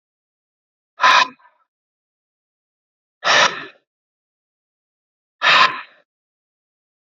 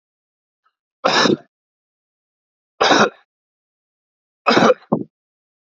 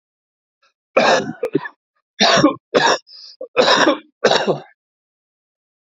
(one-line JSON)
{"exhalation_length": "7.1 s", "exhalation_amplitude": 29020, "exhalation_signal_mean_std_ratio": 0.28, "three_cough_length": "5.6 s", "three_cough_amplitude": 27945, "three_cough_signal_mean_std_ratio": 0.32, "cough_length": "5.8 s", "cough_amplitude": 30214, "cough_signal_mean_std_ratio": 0.45, "survey_phase": "alpha (2021-03-01 to 2021-08-12)", "age": "18-44", "gender": "Male", "wearing_mask": "No", "symptom_new_continuous_cough": true, "symptom_diarrhoea": true, "symptom_fatigue": true, "symptom_fever_high_temperature": true, "symptom_headache": true, "symptom_change_to_sense_of_smell_or_taste": true, "symptom_onset": "3 days", "smoker_status": "Never smoked", "respiratory_condition_asthma": false, "respiratory_condition_other": false, "recruitment_source": "Test and Trace", "submission_delay": "1 day", "covid_test_result": "Positive", "covid_test_method": "RT-qPCR"}